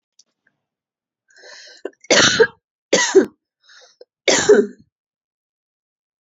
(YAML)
three_cough_length: 6.2 s
three_cough_amplitude: 31694
three_cough_signal_mean_std_ratio: 0.32
survey_phase: beta (2021-08-13 to 2022-03-07)
age: 18-44
gender: Female
wearing_mask: 'No'
symptom_cough_any: true
symptom_runny_or_blocked_nose: true
symptom_sore_throat: true
symptom_fatigue: true
symptom_headache: true
symptom_onset: 5 days
smoker_status: Ex-smoker
respiratory_condition_asthma: true
respiratory_condition_other: false
recruitment_source: Test and Trace
submission_delay: 1 day
covid_test_result: Positive
covid_test_method: RT-qPCR